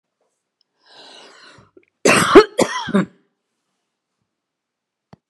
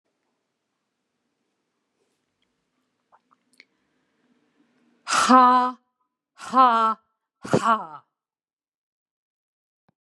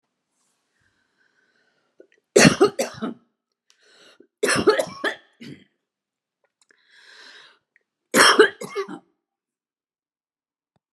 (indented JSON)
{
  "cough_length": "5.3 s",
  "cough_amplitude": 32768,
  "cough_signal_mean_std_ratio": 0.26,
  "exhalation_length": "10.1 s",
  "exhalation_amplitude": 26127,
  "exhalation_signal_mean_std_ratio": 0.27,
  "three_cough_length": "10.9 s",
  "three_cough_amplitude": 31414,
  "three_cough_signal_mean_std_ratio": 0.26,
  "survey_phase": "beta (2021-08-13 to 2022-03-07)",
  "age": "65+",
  "gender": "Female",
  "wearing_mask": "No",
  "symptom_none": true,
  "smoker_status": "Never smoked",
  "respiratory_condition_asthma": false,
  "respiratory_condition_other": false,
  "recruitment_source": "REACT",
  "submission_delay": "1 day",
  "covid_test_result": "Negative",
  "covid_test_method": "RT-qPCR"
}